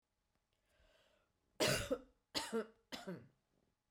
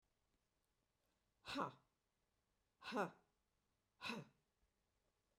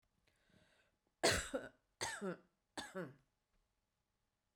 {"three_cough_length": "3.9 s", "three_cough_amplitude": 2556, "three_cough_signal_mean_std_ratio": 0.35, "exhalation_length": "5.4 s", "exhalation_amplitude": 1042, "exhalation_signal_mean_std_ratio": 0.28, "cough_length": "4.6 s", "cough_amplitude": 3283, "cough_signal_mean_std_ratio": 0.31, "survey_phase": "beta (2021-08-13 to 2022-03-07)", "age": "45-64", "gender": "Female", "wearing_mask": "No", "symptom_none": true, "symptom_onset": "2 days", "smoker_status": "Ex-smoker", "respiratory_condition_asthma": false, "respiratory_condition_other": false, "recruitment_source": "REACT", "submission_delay": "1 day", "covid_test_result": "Negative", "covid_test_method": "RT-qPCR"}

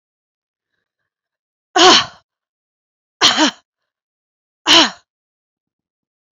{"exhalation_length": "6.3 s", "exhalation_amplitude": 31631, "exhalation_signal_mean_std_ratio": 0.28, "survey_phase": "beta (2021-08-13 to 2022-03-07)", "age": "65+", "gender": "Female", "wearing_mask": "No", "symptom_none": true, "smoker_status": "Never smoked", "respiratory_condition_asthma": false, "respiratory_condition_other": false, "recruitment_source": "REACT", "submission_delay": "2 days", "covid_test_result": "Negative", "covid_test_method": "RT-qPCR", "influenza_a_test_result": "Negative", "influenza_b_test_result": "Negative"}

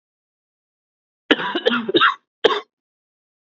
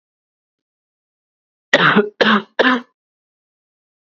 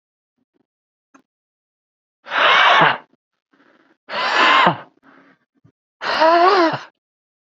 {"cough_length": "3.5 s", "cough_amplitude": 30774, "cough_signal_mean_std_ratio": 0.35, "three_cough_length": "4.0 s", "three_cough_amplitude": 32768, "three_cough_signal_mean_std_ratio": 0.34, "exhalation_length": "7.5 s", "exhalation_amplitude": 32768, "exhalation_signal_mean_std_ratio": 0.43, "survey_phase": "beta (2021-08-13 to 2022-03-07)", "age": "18-44", "gender": "Male", "wearing_mask": "Yes", "symptom_new_continuous_cough": true, "symptom_runny_or_blocked_nose": true, "symptom_sore_throat": true, "symptom_abdominal_pain": true, "symptom_fatigue": true, "symptom_headache": true, "smoker_status": "Never smoked", "respiratory_condition_asthma": false, "respiratory_condition_other": false, "recruitment_source": "Test and Trace", "submission_delay": "1 day", "covid_test_result": "Positive", "covid_test_method": "RT-qPCR", "covid_ct_value": 21.6, "covid_ct_gene": "ORF1ab gene"}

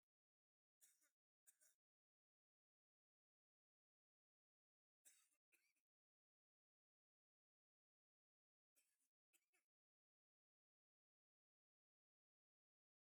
{"three_cough_length": "13.1 s", "three_cough_amplitude": 63, "three_cough_signal_mean_std_ratio": 0.18, "survey_phase": "beta (2021-08-13 to 2022-03-07)", "age": "65+", "gender": "Male", "wearing_mask": "No", "symptom_runny_or_blocked_nose": true, "smoker_status": "Ex-smoker", "respiratory_condition_asthma": false, "respiratory_condition_other": true, "recruitment_source": "REACT", "submission_delay": "1 day", "covid_test_result": "Negative", "covid_test_method": "RT-qPCR", "influenza_a_test_result": "Negative", "influenza_b_test_result": "Negative"}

